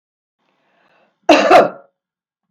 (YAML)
cough_length: 2.5 s
cough_amplitude: 32768
cough_signal_mean_std_ratio: 0.32
survey_phase: beta (2021-08-13 to 2022-03-07)
age: 65+
gender: Female
wearing_mask: 'No'
symptom_none: true
smoker_status: Ex-smoker
respiratory_condition_asthma: false
respiratory_condition_other: false
recruitment_source: REACT
submission_delay: 1 day
covid_test_result: Negative
covid_test_method: RT-qPCR
influenza_a_test_result: Negative
influenza_b_test_result: Negative